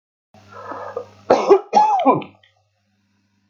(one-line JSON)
{"cough_length": "3.5 s", "cough_amplitude": 32767, "cough_signal_mean_std_ratio": 0.41, "survey_phase": "beta (2021-08-13 to 2022-03-07)", "age": "45-64", "gender": "Male", "wearing_mask": "No", "symptom_none": true, "smoker_status": "Ex-smoker", "respiratory_condition_asthma": false, "respiratory_condition_other": false, "recruitment_source": "REACT", "submission_delay": "8 days", "covid_test_result": "Negative", "covid_test_method": "RT-qPCR"}